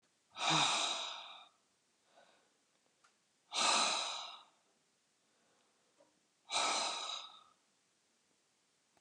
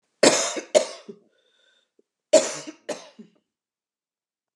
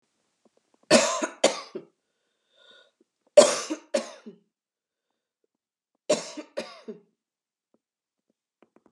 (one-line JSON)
{"exhalation_length": "9.0 s", "exhalation_amplitude": 3624, "exhalation_signal_mean_std_ratio": 0.41, "cough_length": "4.6 s", "cough_amplitude": 28160, "cough_signal_mean_std_ratio": 0.28, "three_cough_length": "8.9 s", "three_cough_amplitude": 26222, "three_cough_signal_mean_std_ratio": 0.23, "survey_phase": "beta (2021-08-13 to 2022-03-07)", "age": "45-64", "gender": "Female", "wearing_mask": "No", "symptom_cough_any": true, "symptom_onset": "12 days", "smoker_status": "Ex-smoker", "respiratory_condition_asthma": false, "respiratory_condition_other": false, "recruitment_source": "REACT", "submission_delay": "2 days", "covid_test_result": "Negative", "covid_test_method": "RT-qPCR", "influenza_a_test_result": "Negative", "influenza_b_test_result": "Negative"}